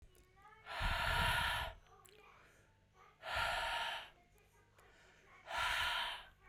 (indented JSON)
{
  "exhalation_length": "6.5 s",
  "exhalation_amplitude": 2598,
  "exhalation_signal_mean_std_ratio": 0.59,
  "survey_phase": "beta (2021-08-13 to 2022-03-07)",
  "age": "18-44",
  "gender": "Female",
  "wearing_mask": "No",
  "symptom_runny_or_blocked_nose": true,
  "symptom_sore_throat": true,
  "symptom_fatigue": true,
  "symptom_headache": true,
  "symptom_change_to_sense_of_smell_or_taste": true,
  "symptom_loss_of_taste": true,
  "symptom_onset": "3 days",
  "smoker_status": "Never smoked",
  "respiratory_condition_asthma": false,
  "respiratory_condition_other": false,
  "recruitment_source": "Test and Trace",
  "submission_delay": "1 day",
  "covid_test_result": "Positive",
  "covid_test_method": "RT-qPCR",
  "covid_ct_value": 17.1,
  "covid_ct_gene": "ORF1ab gene",
  "covid_ct_mean": 17.4,
  "covid_viral_load": "2000000 copies/ml",
  "covid_viral_load_category": "High viral load (>1M copies/ml)"
}